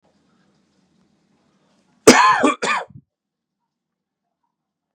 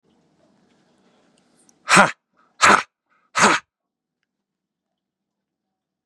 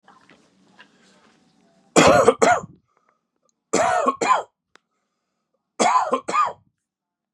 {"cough_length": "4.9 s", "cough_amplitude": 32768, "cough_signal_mean_std_ratio": 0.26, "exhalation_length": "6.1 s", "exhalation_amplitude": 32768, "exhalation_signal_mean_std_ratio": 0.24, "three_cough_length": "7.3 s", "three_cough_amplitude": 31533, "three_cough_signal_mean_std_ratio": 0.38, "survey_phase": "beta (2021-08-13 to 2022-03-07)", "age": "18-44", "gender": "Male", "wearing_mask": "No", "symptom_cough_any": true, "symptom_runny_or_blocked_nose": true, "symptom_change_to_sense_of_smell_or_taste": true, "smoker_status": "Never smoked", "respiratory_condition_asthma": false, "respiratory_condition_other": false, "recruitment_source": "Test and Trace", "submission_delay": "2 days", "covid_test_result": "Positive", "covid_test_method": "LFT"}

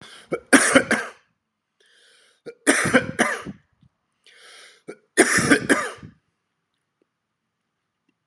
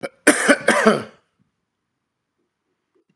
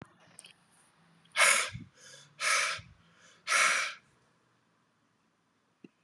{"three_cough_length": "8.3 s", "three_cough_amplitude": 32748, "three_cough_signal_mean_std_ratio": 0.34, "cough_length": "3.2 s", "cough_amplitude": 32767, "cough_signal_mean_std_ratio": 0.33, "exhalation_length": "6.0 s", "exhalation_amplitude": 10595, "exhalation_signal_mean_std_ratio": 0.36, "survey_phase": "beta (2021-08-13 to 2022-03-07)", "age": "45-64", "gender": "Male", "wearing_mask": "No", "symptom_runny_or_blocked_nose": true, "symptom_sore_throat": true, "symptom_headache": true, "symptom_onset": "4 days", "smoker_status": "Ex-smoker", "respiratory_condition_asthma": false, "respiratory_condition_other": false, "recruitment_source": "Test and Trace", "submission_delay": "2 days", "covid_test_result": "Positive", "covid_test_method": "RT-qPCR", "covid_ct_value": 20.6, "covid_ct_gene": "ORF1ab gene"}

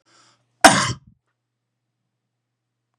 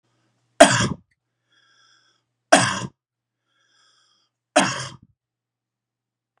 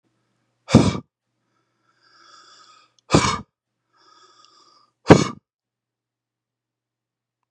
{"cough_length": "3.0 s", "cough_amplitude": 32768, "cough_signal_mean_std_ratio": 0.2, "three_cough_length": "6.4 s", "three_cough_amplitude": 32768, "three_cough_signal_mean_std_ratio": 0.23, "exhalation_length": "7.5 s", "exhalation_amplitude": 32768, "exhalation_signal_mean_std_ratio": 0.2, "survey_phase": "beta (2021-08-13 to 2022-03-07)", "age": "45-64", "gender": "Male", "wearing_mask": "No", "symptom_abdominal_pain": true, "symptom_headache": true, "smoker_status": "Never smoked", "respiratory_condition_asthma": false, "respiratory_condition_other": false, "recruitment_source": "REACT", "submission_delay": "1 day", "covid_test_result": "Negative", "covid_test_method": "RT-qPCR", "influenza_a_test_result": "Unknown/Void", "influenza_b_test_result": "Unknown/Void"}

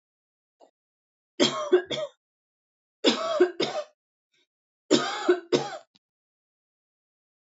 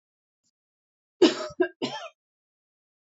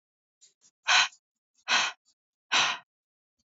{"three_cough_length": "7.6 s", "three_cough_amplitude": 17946, "three_cough_signal_mean_std_ratio": 0.35, "cough_length": "3.2 s", "cough_amplitude": 15659, "cough_signal_mean_std_ratio": 0.25, "exhalation_length": "3.6 s", "exhalation_amplitude": 11932, "exhalation_signal_mean_std_ratio": 0.34, "survey_phase": "beta (2021-08-13 to 2022-03-07)", "age": "45-64", "gender": "Female", "wearing_mask": "No", "symptom_none": true, "smoker_status": "Ex-smoker", "respiratory_condition_asthma": false, "respiratory_condition_other": false, "recruitment_source": "REACT", "submission_delay": "3 days", "covid_test_result": "Negative", "covid_test_method": "RT-qPCR", "influenza_a_test_result": "Negative", "influenza_b_test_result": "Negative"}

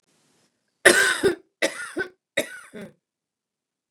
{"three_cough_length": "3.9 s", "three_cough_amplitude": 29203, "three_cough_signal_mean_std_ratio": 0.32, "survey_phase": "beta (2021-08-13 to 2022-03-07)", "age": "45-64", "gender": "Female", "wearing_mask": "No", "symptom_cough_any": true, "symptom_runny_or_blocked_nose": true, "symptom_sore_throat": true, "symptom_fatigue": true, "symptom_headache": true, "symptom_change_to_sense_of_smell_or_taste": true, "smoker_status": "Ex-smoker", "respiratory_condition_asthma": false, "respiratory_condition_other": false, "recruitment_source": "Test and Trace", "submission_delay": "1 day", "covid_test_result": "Positive", "covid_test_method": "LFT"}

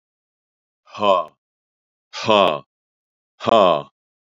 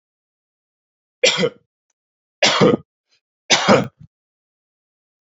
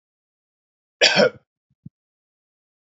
{"exhalation_length": "4.3 s", "exhalation_amplitude": 29028, "exhalation_signal_mean_std_ratio": 0.33, "three_cough_length": "5.2 s", "three_cough_amplitude": 30892, "three_cough_signal_mean_std_ratio": 0.32, "cough_length": "3.0 s", "cough_amplitude": 32410, "cough_signal_mean_std_ratio": 0.23, "survey_phase": "beta (2021-08-13 to 2022-03-07)", "age": "65+", "gender": "Male", "wearing_mask": "No", "symptom_none": true, "smoker_status": "Never smoked", "respiratory_condition_asthma": false, "respiratory_condition_other": false, "recruitment_source": "REACT", "submission_delay": "1 day", "covid_test_result": "Negative", "covid_test_method": "RT-qPCR", "influenza_a_test_result": "Negative", "influenza_b_test_result": "Negative"}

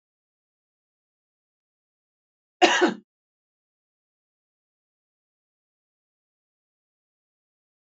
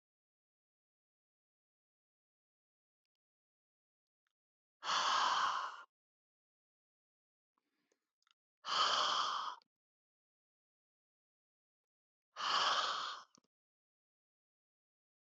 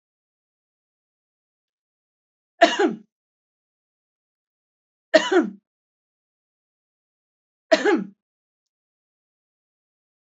{"cough_length": "7.9 s", "cough_amplitude": 22314, "cough_signal_mean_std_ratio": 0.14, "exhalation_length": "15.3 s", "exhalation_amplitude": 2567, "exhalation_signal_mean_std_ratio": 0.33, "three_cough_length": "10.2 s", "three_cough_amplitude": 30013, "three_cough_signal_mean_std_ratio": 0.21, "survey_phase": "beta (2021-08-13 to 2022-03-07)", "age": "45-64", "gender": "Female", "wearing_mask": "No", "symptom_none": true, "smoker_status": "Never smoked", "respiratory_condition_asthma": false, "respiratory_condition_other": false, "recruitment_source": "REACT", "submission_delay": "1 day", "covid_test_result": "Negative", "covid_test_method": "RT-qPCR"}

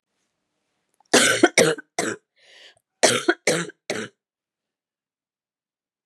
{"cough_length": "6.1 s", "cough_amplitude": 30406, "cough_signal_mean_std_ratio": 0.32, "survey_phase": "beta (2021-08-13 to 2022-03-07)", "age": "45-64", "gender": "Female", "wearing_mask": "No", "symptom_cough_any": true, "symptom_runny_or_blocked_nose": true, "symptom_sore_throat": true, "symptom_fatigue": true, "symptom_headache": true, "smoker_status": "Never smoked", "respiratory_condition_asthma": false, "respiratory_condition_other": false, "recruitment_source": "Test and Trace", "submission_delay": "2 days", "covid_test_result": "Positive", "covid_test_method": "RT-qPCR", "covid_ct_value": 22.0, "covid_ct_gene": "S gene", "covid_ct_mean": 22.4, "covid_viral_load": "44000 copies/ml", "covid_viral_load_category": "Low viral load (10K-1M copies/ml)"}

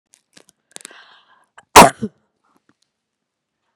{"cough_length": "3.8 s", "cough_amplitude": 32768, "cough_signal_mean_std_ratio": 0.17, "survey_phase": "beta (2021-08-13 to 2022-03-07)", "age": "65+", "gender": "Female", "wearing_mask": "No", "symptom_none": true, "smoker_status": "Never smoked", "respiratory_condition_asthma": false, "respiratory_condition_other": false, "recruitment_source": "REACT", "submission_delay": "2 days", "covid_test_result": "Negative", "covid_test_method": "RT-qPCR"}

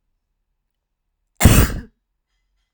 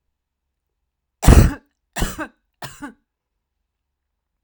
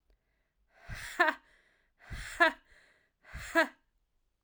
{"cough_length": "2.7 s", "cough_amplitude": 32768, "cough_signal_mean_std_ratio": 0.27, "three_cough_length": "4.4 s", "three_cough_amplitude": 32768, "three_cough_signal_mean_std_ratio": 0.23, "exhalation_length": "4.4 s", "exhalation_amplitude": 9682, "exhalation_signal_mean_std_ratio": 0.29, "survey_phase": "alpha (2021-03-01 to 2021-08-12)", "age": "18-44", "gender": "Female", "wearing_mask": "No", "symptom_none": true, "smoker_status": "Never smoked", "respiratory_condition_asthma": false, "respiratory_condition_other": false, "recruitment_source": "REACT", "submission_delay": "1 day", "covid_test_result": "Negative", "covid_test_method": "RT-qPCR"}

